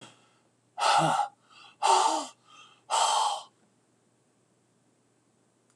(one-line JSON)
{"exhalation_length": "5.8 s", "exhalation_amplitude": 10312, "exhalation_signal_mean_std_ratio": 0.42, "survey_phase": "beta (2021-08-13 to 2022-03-07)", "age": "65+", "gender": "Male", "wearing_mask": "No", "symptom_none": true, "smoker_status": "Never smoked", "respiratory_condition_asthma": false, "respiratory_condition_other": false, "recruitment_source": "REACT", "submission_delay": "2 days", "covid_test_result": "Negative", "covid_test_method": "RT-qPCR", "influenza_a_test_result": "Negative", "influenza_b_test_result": "Negative"}